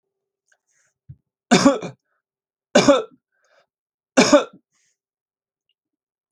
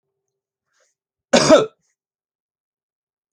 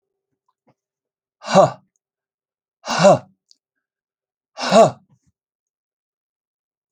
three_cough_length: 6.3 s
three_cough_amplitude: 29423
three_cough_signal_mean_std_ratio: 0.26
cough_length: 3.3 s
cough_amplitude: 29017
cough_signal_mean_std_ratio: 0.23
exhalation_length: 6.9 s
exhalation_amplitude: 29490
exhalation_signal_mean_std_ratio: 0.25
survey_phase: alpha (2021-03-01 to 2021-08-12)
age: 45-64
gender: Male
wearing_mask: 'No'
symptom_none: true
smoker_status: Never smoked
respiratory_condition_asthma: false
respiratory_condition_other: false
recruitment_source: REACT
submission_delay: 1 day
covid_test_result: Negative
covid_test_method: RT-qPCR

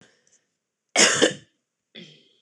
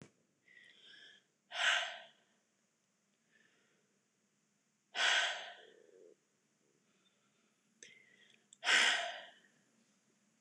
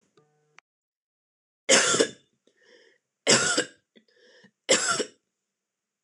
cough_length: 2.4 s
cough_amplitude: 23918
cough_signal_mean_std_ratio: 0.3
exhalation_length: 10.4 s
exhalation_amplitude: 4317
exhalation_signal_mean_std_ratio: 0.3
three_cough_length: 6.0 s
three_cough_amplitude: 19102
three_cough_signal_mean_std_ratio: 0.33
survey_phase: beta (2021-08-13 to 2022-03-07)
age: 18-44
gender: Female
wearing_mask: 'No'
symptom_none: true
smoker_status: Never smoked
respiratory_condition_asthma: false
respiratory_condition_other: false
recruitment_source: REACT
submission_delay: 2 days
covid_test_result: Negative
covid_test_method: RT-qPCR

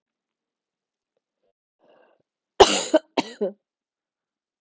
cough_length: 4.6 s
cough_amplitude: 32766
cough_signal_mean_std_ratio: 0.19
survey_phase: alpha (2021-03-01 to 2021-08-12)
age: 18-44
gender: Female
wearing_mask: 'No'
symptom_cough_any: true
symptom_fatigue: true
symptom_fever_high_temperature: true
symptom_headache: true
symptom_change_to_sense_of_smell_or_taste: true
symptom_loss_of_taste: true
symptom_onset: 4 days
smoker_status: Never smoked
respiratory_condition_asthma: false
respiratory_condition_other: false
recruitment_source: Test and Trace
submission_delay: 2 days
covid_test_result: Positive
covid_test_method: RT-qPCR
covid_ct_value: 13.2
covid_ct_gene: ORF1ab gene
covid_ct_mean: 13.3
covid_viral_load: 43000000 copies/ml
covid_viral_load_category: High viral load (>1M copies/ml)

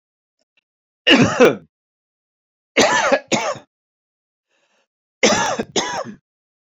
three_cough_length: 6.7 s
three_cough_amplitude: 28622
three_cough_signal_mean_std_ratio: 0.38
survey_phase: beta (2021-08-13 to 2022-03-07)
age: 45-64
gender: Male
wearing_mask: 'No'
symptom_none: true
symptom_onset: 7 days
smoker_status: Ex-smoker
respiratory_condition_asthma: true
respiratory_condition_other: false
recruitment_source: REACT
submission_delay: 1 day
covid_test_result: Negative
covid_test_method: RT-qPCR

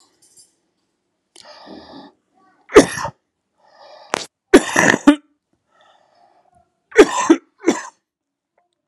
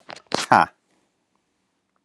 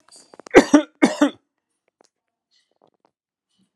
three_cough_length: 8.9 s
three_cough_amplitude: 32768
three_cough_signal_mean_std_ratio: 0.25
exhalation_length: 2.0 s
exhalation_amplitude: 32277
exhalation_signal_mean_std_ratio: 0.21
cough_length: 3.8 s
cough_amplitude: 32768
cough_signal_mean_std_ratio: 0.23
survey_phase: alpha (2021-03-01 to 2021-08-12)
age: 18-44
gender: Male
wearing_mask: 'No'
symptom_cough_any: true
symptom_diarrhoea: true
symptom_fatigue: true
symptom_fever_high_temperature: true
symptom_headache: true
smoker_status: Never smoked
respiratory_condition_asthma: false
respiratory_condition_other: false
recruitment_source: Test and Trace
submission_delay: 3 days
covid_test_result: Positive
covid_test_method: RT-qPCR
covid_ct_value: 12.3
covid_ct_gene: ORF1ab gene
covid_ct_mean: 12.9
covid_viral_load: 60000000 copies/ml
covid_viral_load_category: High viral load (>1M copies/ml)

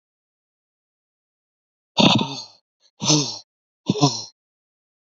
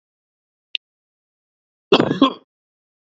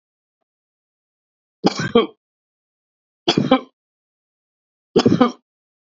exhalation_length: 5.0 s
exhalation_amplitude: 27706
exhalation_signal_mean_std_ratio: 0.32
cough_length: 3.1 s
cough_amplitude: 32768
cough_signal_mean_std_ratio: 0.23
three_cough_length: 6.0 s
three_cough_amplitude: 27321
three_cough_signal_mean_std_ratio: 0.28
survey_phase: alpha (2021-03-01 to 2021-08-12)
age: 45-64
gender: Male
wearing_mask: 'No'
symptom_cough_any: true
symptom_shortness_of_breath: true
symptom_fatigue: true
symptom_headache: true
symptom_change_to_sense_of_smell_or_taste: true
symptom_loss_of_taste: true
symptom_onset: 3 days
smoker_status: Never smoked
respiratory_condition_asthma: false
respiratory_condition_other: false
recruitment_source: Test and Trace
submission_delay: 2 days
covid_test_result: Positive
covid_test_method: RT-qPCR
covid_ct_value: 16.5
covid_ct_gene: ORF1ab gene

